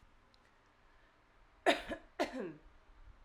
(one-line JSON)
{"cough_length": "3.2 s", "cough_amplitude": 5607, "cough_signal_mean_std_ratio": 0.31, "survey_phase": "alpha (2021-03-01 to 2021-08-12)", "age": "18-44", "gender": "Female", "wearing_mask": "No", "symptom_diarrhoea": true, "symptom_fever_high_temperature": true, "symptom_change_to_sense_of_smell_or_taste": true, "symptom_loss_of_taste": true, "symptom_onset": "2 days", "smoker_status": "Current smoker (1 to 10 cigarettes per day)", "respiratory_condition_asthma": false, "respiratory_condition_other": false, "recruitment_source": "Test and Trace", "submission_delay": "1 day", "covid_test_result": "Positive", "covid_test_method": "RT-qPCR"}